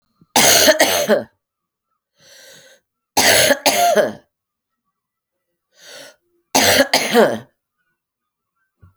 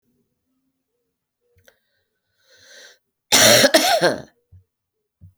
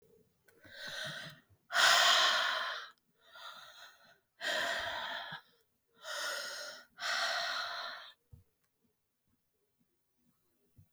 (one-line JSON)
{"three_cough_length": "9.0 s", "three_cough_amplitude": 32768, "three_cough_signal_mean_std_ratio": 0.43, "cough_length": "5.4 s", "cough_amplitude": 32768, "cough_signal_mean_std_ratio": 0.31, "exhalation_length": "10.9 s", "exhalation_amplitude": 7579, "exhalation_signal_mean_std_ratio": 0.45, "survey_phase": "alpha (2021-03-01 to 2021-08-12)", "age": "45-64", "gender": "Female", "wearing_mask": "No", "symptom_cough_any": true, "symptom_fatigue": true, "symptom_headache": true, "symptom_change_to_sense_of_smell_or_taste": true, "symptom_loss_of_taste": true, "symptom_onset": "3 days", "smoker_status": "Ex-smoker", "respiratory_condition_asthma": false, "respiratory_condition_other": false, "recruitment_source": "Test and Trace", "submission_delay": "2 days", "covid_test_result": "Positive", "covid_test_method": "RT-qPCR", "covid_ct_value": 14.1, "covid_ct_gene": "N gene", "covid_ct_mean": 15.8, "covid_viral_load": "6800000 copies/ml", "covid_viral_load_category": "High viral load (>1M copies/ml)"}